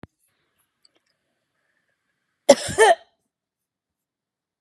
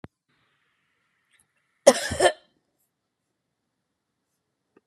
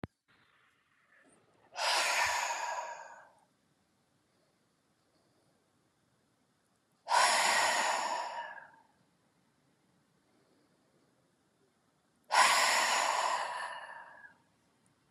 {
  "three_cough_length": "4.6 s",
  "three_cough_amplitude": 32572,
  "three_cough_signal_mean_std_ratio": 0.19,
  "cough_length": "4.9 s",
  "cough_amplitude": 31261,
  "cough_signal_mean_std_ratio": 0.17,
  "exhalation_length": "15.1 s",
  "exhalation_amplitude": 7670,
  "exhalation_signal_mean_std_ratio": 0.42,
  "survey_phase": "beta (2021-08-13 to 2022-03-07)",
  "age": "65+",
  "gender": "Female",
  "wearing_mask": "No",
  "symptom_none": true,
  "smoker_status": "Never smoked",
  "respiratory_condition_asthma": false,
  "respiratory_condition_other": true,
  "recruitment_source": "REACT",
  "submission_delay": "1 day",
  "covid_test_result": "Negative",
  "covid_test_method": "RT-qPCR"
}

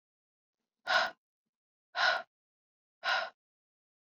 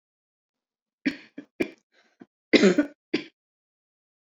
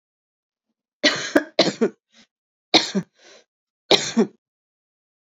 {
  "exhalation_length": "4.0 s",
  "exhalation_amplitude": 5477,
  "exhalation_signal_mean_std_ratio": 0.33,
  "cough_length": "4.4 s",
  "cough_amplitude": 27250,
  "cough_signal_mean_std_ratio": 0.24,
  "three_cough_length": "5.2 s",
  "three_cough_amplitude": 32767,
  "three_cough_signal_mean_std_ratio": 0.31,
  "survey_phase": "beta (2021-08-13 to 2022-03-07)",
  "age": "45-64",
  "gender": "Female",
  "wearing_mask": "No",
  "symptom_cough_any": true,
  "symptom_runny_or_blocked_nose": true,
  "symptom_sore_throat": true,
  "symptom_fatigue": true,
  "symptom_fever_high_temperature": true,
  "symptom_headache": true,
  "symptom_change_to_sense_of_smell_or_taste": true,
  "smoker_status": "Never smoked",
  "respiratory_condition_asthma": false,
  "respiratory_condition_other": false,
  "recruitment_source": "Test and Trace",
  "submission_delay": "2 days",
  "covid_test_result": "Positive",
  "covid_test_method": "RT-qPCR",
  "covid_ct_value": 25.7,
  "covid_ct_gene": "ORF1ab gene",
  "covid_ct_mean": 26.6,
  "covid_viral_load": "1900 copies/ml",
  "covid_viral_load_category": "Minimal viral load (< 10K copies/ml)"
}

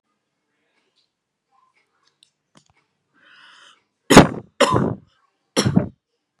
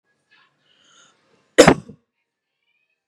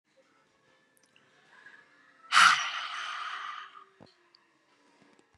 {
  "three_cough_length": "6.4 s",
  "three_cough_amplitude": 32768,
  "three_cough_signal_mean_std_ratio": 0.23,
  "cough_length": "3.1 s",
  "cough_amplitude": 32768,
  "cough_signal_mean_std_ratio": 0.17,
  "exhalation_length": "5.4 s",
  "exhalation_amplitude": 14579,
  "exhalation_signal_mean_std_ratio": 0.28,
  "survey_phase": "beta (2021-08-13 to 2022-03-07)",
  "age": "18-44",
  "gender": "Female",
  "wearing_mask": "No",
  "symptom_none": true,
  "smoker_status": "Never smoked",
  "respiratory_condition_asthma": false,
  "respiratory_condition_other": false,
  "recruitment_source": "REACT",
  "submission_delay": "2 days",
  "covid_test_result": "Negative",
  "covid_test_method": "RT-qPCR",
  "influenza_a_test_result": "Negative",
  "influenza_b_test_result": "Negative"
}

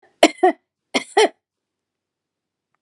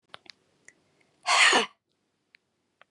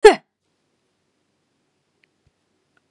{
  "three_cough_length": "2.8 s",
  "three_cough_amplitude": 32768,
  "three_cough_signal_mean_std_ratio": 0.26,
  "exhalation_length": "2.9 s",
  "exhalation_amplitude": 13314,
  "exhalation_signal_mean_std_ratio": 0.3,
  "cough_length": "2.9 s",
  "cough_amplitude": 32768,
  "cough_signal_mean_std_ratio": 0.14,
  "survey_phase": "beta (2021-08-13 to 2022-03-07)",
  "age": "45-64",
  "gender": "Female",
  "wearing_mask": "No",
  "symptom_cough_any": true,
  "smoker_status": "Never smoked",
  "respiratory_condition_asthma": false,
  "respiratory_condition_other": false,
  "recruitment_source": "REACT",
  "submission_delay": "2 days",
  "covid_test_result": "Negative",
  "covid_test_method": "RT-qPCR",
  "influenza_a_test_result": "Negative",
  "influenza_b_test_result": "Negative"
}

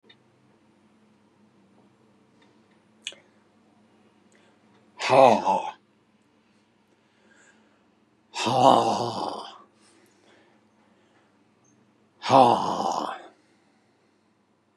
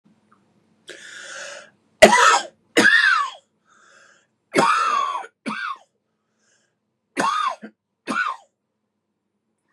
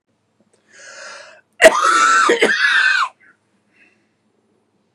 {
  "exhalation_length": "14.8 s",
  "exhalation_amplitude": 26374,
  "exhalation_signal_mean_std_ratio": 0.28,
  "three_cough_length": "9.7 s",
  "three_cough_amplitude": 32768,
  "three_cough_signal_mean_std_ratio": 0.38,
  "cough_length": "4.9 s",
  "cough_amplitude": 32768,
  "cough_signal_mean_std_ratio": 0.45,
  "survey_phase": "beta (2021-08-13 to 2022-03-07)",
  "age": "65+",
  "gender": "Male",
  "wearing_mask": "No",
  "symptom_other": true,
  "smoker_status": "Ex-smoker",
  "respiratory_condition_asthma": true,
  "respiratory_condition_other": false,
  "recruitment_source": "REACT",
  "submission_delay": "2 days",
  "covid_test_result": "Negative",
  "covid_test_method": "RT-qPCR",
  "influenza_a_test_result": "Negative",
  "influenza_b_test_result": "Negative"
}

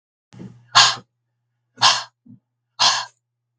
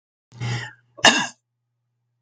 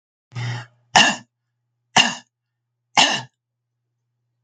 {
  "exhalation_length": "3.6 s",
  "exhalation_amplitude": 32768,
  "exhalation_signal_mean_std_ratio": 0.32,
  "cough_length": "2.2 s",
  "cough_amplitude": 32766,
  "cough_signal_mean_std_ratio": 0.3,
  "three_cough_length": "4.4 s",
  "three_cough_amplitude": 32766,
  "three_cough_signal_mean_std_ratio": 0.3,
  "survey_phase": "beta (2021-08-13 to 2022-03-07)",
  "age": "65+",
  "gender": "Female",
  "wearing_mask": "No",
  "symptom_cough_any": true,
  "smoker_status": "Never smoked",
  "respiratory_condition_asthma": false,
  "respiratory_condition_other": false,
  "recruitment_source": "REACT",
  "submission_delay": "2 days",
  "covid_test_result": "Negative",
  "covid_test_method": "RT-qPCR",
  "influenza_a_test_result": "Negative",
  "influenza_b_test_result": "Negative"
}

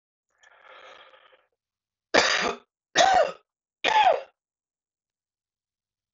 {
  "three_cough_length": "6.1 s",
  "three_cough_amplitude": 24459,
  "three_cough_signal_mean_std_ratio": 0.33,
  "survey_phase": "beta (2021-08-13 to 2022-03-07)",
  "age": "45-64",
  "gender": "Male",
  "wearing_mask": "No",
  "symptom_cough_any": true,
  "symptom_runny_or_blocked_nose": true,
  "symptom_shortness_of_breath": true,
  "symptom_onset": "5 days",
  "smoker_status": "Ex-smoker",
  "respiratory_condition_asthma": false,
  "respiratory_condition_other": false,
  "recruitment_source": "Test and Trace",
  "submission_delay": "2 days",
  "covid_test_result": "Positive",
  "covid_test_method": "RT-qPCR",
  "covid_ct_value": 33.9,
  "covid_ct_gene": "N gene"
}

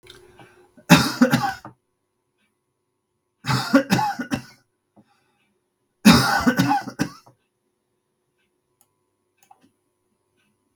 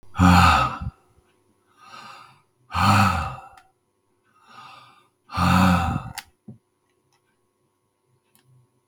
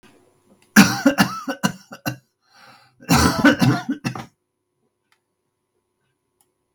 {
  "three_cough_length": "10.8 s",
  "three_cough_amplitude": 32768,
  "three_cough_signal_mean_std_ratio": 0.31,
  "exhalation_length": "8.9 s",
  "exhalation_amplitude": 25392,
  "exhalation_signal_mean_std_ratio": 0.38,
  "cough_length": "6.7 s",
  "cough_amplitude": 32768,
  "cough_signal_mean_std_ratio": 0.35,
  "survey_phase": "beta (2021-08-13 to 2022-03-07)",
  "age": "45-64",
  "gender": "Male",
  "wearing_mask": "No",
  "symptom_cough_any": true,
  "symptom_runny_or_blocked_nose": true,
  "symptom_diarrhoea": true,
  "symptom_fatigue": true,
  "symptom_headache": true,
  "smoker_status": "Never smoked",
  "respiratory_condition_asthma": false,
  "respiratory_condition_other": false,
  "recruitment_source": "Test and Trace",
  "submission_delay": "2 days",
  "covid_test_result": "Positive",
  "covid_test_method": "LFT"
}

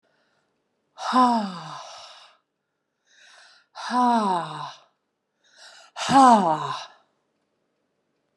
{
  "exhalation_length": "8.4 s",
  "exhalation_amplitude": 24775,
  "exhalation_signal_mean_std_ratio": 0.36,
  "survey_phase": "beta (2021-08-13 to 2022-03-07)",
  "age": "65+",
  "gender": "Female",
  "wearing_mask": "No",
  "symptom_runny_or_blocked_nose": true,
  "symptom_change_to_sense_of_smell_or_taste": true,
  "smoker_status": "Ex-smoker",
  "respiratory_condition_asthma": false,
  "respiratory_condition_other": false,
  "recruitment_source": "Test and Trace",
  "submission_delay": "2 days",
  "covid_test_result": "Positive",
  "covid_test_method": "RT-qPCR",
  "covid_ct_value": 32.8,
  "covid_ct_gene": "N gene",
  "covid_ct_mean": 33.2,
  "covid_viral_load": "13 copies/ml",
  "covid_viral_load_category": "Minimal viral load (< 10K copies/ml)"
}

